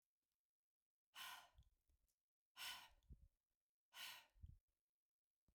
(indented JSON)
{
  "exhalation_length": "5.5 s",
  "exhalation_amplitude": 282,
  "exhalation_signal_mean_std_ratio": 0.37,
  "survey_phase": "beta (2021-08-13 to 2022-03-07)",
  "age": "45-64",
  "gender": "Female",
  "wearing_mask": "No",
  "symptom_none": true,
  "smoker_status": "Ex-smoker",
  "respiratory_condition_asthma": false,
  "respiratory_condition_other": false,
  "recruitment_source": "REACT",
  "submission_delay": "1 day",
  "covid_test_result": "Negative",
  "covid_test_method": "RT-qPCR"
}